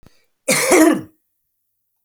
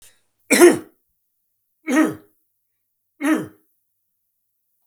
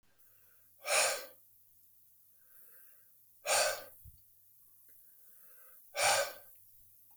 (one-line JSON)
{"cough_length": "2.0 s", "cough_amplitude": 32768, "cough_signal_mean_std_ratio": 0.41, "three_cough_length": "4.9 s", "three_cough_amplitude": 32768, "three_cough_signal_mean_std_ratio": 0.29, "exhalation_length": "7.2 s", "exhalation_amplitude": 5148, "exhalation_signal_mean_std_ratio": 0.36, "survey_phase": "beta (2021-08-13 to 2022-03-07)", "age": "45-64", "gender": "Male", "wearing_mask": "No", "symptom_none": true, "smoker_status": "Never smoked", "respiratory_condition_asthma": false, "respiratory_condition_other": false, "recruitment_source": "REACT", "submission_delay": "4 days", "covid_test_result": "Negative", "covid_test_method": "RT-qPCR"}